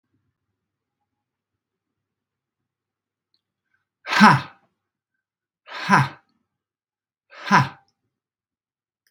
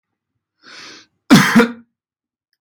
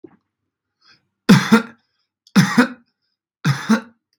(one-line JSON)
{"exhalation_length": "9.1 s", "exhalation_amplitude": 32767, "exhalation_signal_mean_std_ratio": 0.21, "cough_length": "2.6 s", "cough_amplitude": 32767, "cough_signal_mean_std_ratio": 0.31, "three_cough_length": "4.2 s", "three_cough_amplitude": 32768, "three_cough_signal_mean_std_ratio": 0.34, "survey_phase": "beta (2021-08-13 to 2022-03-07)", "age": "18-44", "gender": "Male", "wearing_mask": "No", "symptom_none": true, "smoker_status": "Never smoked", "respiratory_condition_asthma": false, "respiratory_condition_other": false, "recruitment_source": "REACT", "submission_delay": "14 days", "covid_test_result": "Negative", "covid_test_method": "RT-qPCR"}